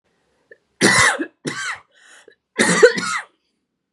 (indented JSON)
{
  "three_cough_length": "3.9 s",
  "three_cough_amplitude": 32768,
  "three_cough_signal_mean_std_ratio": 0.41,
  "survey_phase": "beta (2021-08-13 to 2022-03-07)",
  "age": "18-44",
  "gender": "Female",
  "wearing_mask": "No",
  "symptom_none": true,
  "smoker_status": "Current smoker (1 to 10 cigarettes per day)",
  "respiratory_condition_asthma": false,
  "respiratory_condition_other": false,
  "recruitment_source": "REACT",
  "submission_delay": "2 days",
  "covid_test_result": "Negative",
  "covid_test_method": "RT-qPCR",
  "influenza_a_test_result": "Negative",
  "influenza_b_test_result": "Negative"
}